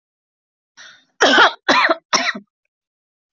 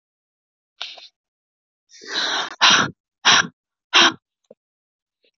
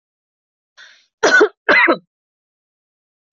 {
  "three_cough_length": "3.3 s",
  "three_cough_amplitude": 32768,
  "three_cough_signal_mean_std_ratio": 0.39,
  "exhalation_length": "5.4 s",
  "exhalation_amplitude": 31122,
  "exhalation_signal_mean_std_ratio": 0.33,
  "cough_length": "3.3 s",
  "cough_amplitude": 25196,
  "cough_signal_mean_std_ratio": 0.34,
  "survey_phase": "alpha (2021-03-01 to 2021-08-12)",
  "age": "18-44",
  "gender": "Female",
  "wearing_mask": "No",
  "symptom_none": true,
  "smoker_status": "Never smoked",
  "respiratory_condition_asthma": false,
  "respiratory_condition_other": false,
  "recruitment_source": "REACT",
  "submission_delay": "1 day",
  "covid_test_result": "Negative",
  "covid_test_method": "RT-qPCR"
}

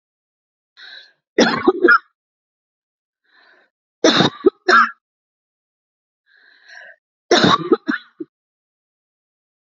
{
  "three_cough_length": "9.7 s",
  "three_cough_amplitude": 29949,
  "three_cough_signal_mean_std_ratio": 0.3,
  "survey_phase": "alpha (2021-03-01 to 2021-08-12)",
  "age": "45-64",
  "gender": "Female",
  "wearing_mask": "No",
  "symptom_none": true,
  "smoker_status": "Ex-smoker",
  "respiratory_condition_asthma": false,
  "respiratory_condition_other": false,
  "recruitment_source": "REACT",
  "submission_delay": "2 days",
  "covid_test_result": "Negative",
  "covid_test_method": "RT-qPCR"
}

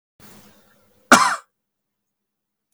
{
  "cough_length": "2.7 s",
  "cough_amplitude": 32544,
  "cough_signal_mean_std_ratio": 0.22,
  "survey_phase": "beta (2021-08-13 to 2022-03-07)",
  "age": "18-44",
  "gender": "Male",
  "wearing_mask": "No",
  "symptom_none": true,
  "smoker_status": "Never smoked",
  "respiratory_condition_asthma": false,
  "respiratory_condition_other": false,
  "recruitment_source": "REACT",
  "submission_delay": "1 day",
  "covid_test_result": "Negative",
  "covid_test_method": "RT-qPCR",
  "influenza_a_test_result": "Negative",
  "influenza_b_test_result": "Negative"
}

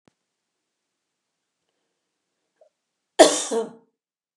{
  "cough_length": "4.4 s",
  "cough_amplitude": 32768,
  "cough_signal_mean_std_ratio": 0.19,
  "survey_phase": "beta (2021-08-13 to 2022-03-07)",
  "age": "45-64",
  "gender": "Female",
  "wearing_mask": "No",
  "symptom_none": true,
  "smoker_status": "Never smoked",
  "respiratory_condition_asthma": false,
  "respiratory_condition_other": false,
  "recruitment_source": "REACT",
  "submission_delay": "1 day",
  "covid_test_result": "Negative",
  "covid_test_method": "RT-qPCR",
  "influenza_a_test_result": "Negative",
  "influenza_b_test_result": "Negative"
}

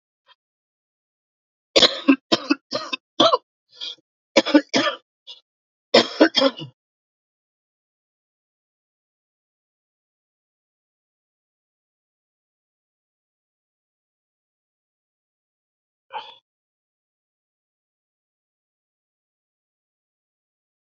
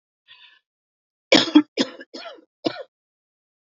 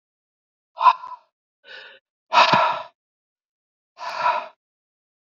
{
  "three_cough_length": "20.9 s",
  "three_cough_amplitude": 32768,
  "three_cough_signal_mean_std_ratio": 0.19,
  "cough_length": "3.7 s",
  "cough_amplitude": 28435,
  "cough_signal_mean_std_ratio": 0.24,
  "exhalation_length": "5.4 s",
  "exhalation_amplitude": 27138,
  "exhalation_signal_mean_std_ratio": 0.32,
  "survey_phase": "beta (2021-08-13 to 2022-03-07)",
  "age": "45-64",
  "gender": "Male",
  "wearing_mask": "No",
  "symptom_cough_any": true,
  "symptom_runny_or_blocked_nose": true,
  "symptom_fatigue": true,
  "symptom_other": true,
  "symptom_onset": "5 days",
  "smoker_status": "Never smoked",
  "respiratory_condition_asthma": false,
  "respiratory_condition_other": false,
  "recruitment_source": "Test and Trace",
  "submission_delay": "2 days",
  "covid_test_result": "Positive",
  "covid_test_method": "RT-qPCR",
  "covid_ct_value": 15.2,
  "covid_ct_gene": "ORF1ab gene",
  "covid_ct_mean": 15.5,
  "covid_viral_load": "8000000 copies/ml",
  "covid_viral_load_category": "High viral load (>1M copies/ml)"
}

